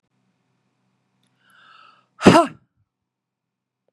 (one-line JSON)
{"exhalation_length": "3.9 s", "exhalation_amplitude": 32768, "exhalation_signal_mean_std_ratio": 0.18, "survey_phase": "beta (2021-08-13 to 2022-03-07)", "age": "18-44", "gender": "Female", "wearing_mask": "No", "symptom_cough_any": true, "symptom_runny_or_blocked_nose": true, "symptom_sore_throat": true, "symptom_fatigue": true, "symptom_fever_high_temperature": true, "symptom_headache": true, "symptom_other": true, "symptom_onset": "3 days", "smoker_status": "Ex-smoker", "respiratory_condition_asthma": false, "respiratory_condition_other": false, "recruitment_source": "Test and Trace", "submission_delay": "2 days", "covid_test_result": "Positive", "covid_test_method": "RT-qPCR", "covid_ct_value": 27.5, "covid_ct_gene": "ORF1ab gene", "covid_ct_mean": 27.8, "covid_viral_load": "740 copies/ml", "covid_viral_load_category": "Minimal viral load (< 10K copies/ml)"}